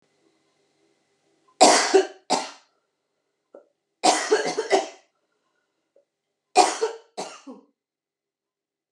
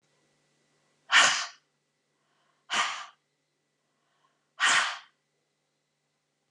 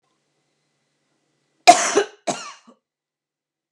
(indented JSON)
{
  "three_cough_length": "8.9 s",
  "three_cough_amplitude": 29681,
  "three_cough_signal_mean_std_ratio": 0.31,
  "exhalation_length": "6.5 s",
  "exhalation_amplitude": 15886,
  "exhalation_signal_mean_std_ratio": 0.28,
  "cough_length": "3.7 s",
  "cough_amplitude": 32768,
  "cough_signal_mean_std_ratio": 0.22,
  "survey_phase": "beta (2021-08-13 to 2022-03-07)",
  "age": "45-64",
  "gender": "Female",
  "wearing_mask": "No",
  "symptom_cough_any": true,
  "symptom_sore_throat": true,
  "symptom_fever_high_temperature": true,
  "symptom_headache": true,
  "symptom_onset": "8 days",
  "smoker_status": "Never smoked",
  "respiratory_condition_asthma": false,
  "respiratory_condition_other": false,
  "recruitment_source": "Test and Trace",
  "submission_delay": "1 day",
  "covid_test_result": "Positive",
  "covid_test_method": "RT-qPCR",
  "covid_ct_value": 20.0,
  "covid_ct_gene": "ORF1ab gene",
  "covid_ct_mean": 20.4,
  "covid_viral_load": "200000 copies/ml",
  "covid_viral_load_category": "Low viral load (10K-1M copies/ml)"
}